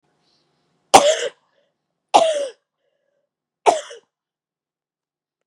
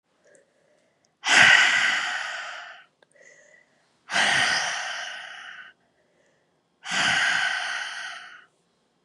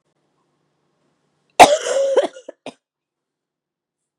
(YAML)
three_cough_length: 5.5 s
three_cough_amplitude: 32768
three_cough_signal_mean_std_ratio: 0.26
exhalation_length: 9.0 s
exhalation_amplitude: 24377
exhalation_signal_mean_std_ratio: 0.47
cough_length: 4.2 s
cough_amplitude: 32768
cough_signal_mean_std_ratio: 0.26
survey_phase: beta (2021-08-13 to 2022-03-07)
age: 18-44
gender: Female
wearing_mask: 'No'
symptom_runny_or_blocked_nose: true
symptom_change_to_sense_of_smell_or_taste: true
symptom_loss_of_taste: true
symptom_onset: 3 days
smoker_status: Current smoker (e-cigarettes or vapes only)
respiratory_condition_asthma: false
respiratory_condition_other: false
recruitment_source: Test and Trace
submission_delay: 2 days
covid_test_result: Positive
covid_test_method: RT-qPCR
covid_ct_value: 19.4
covid_ct_gene: ORF1ab gene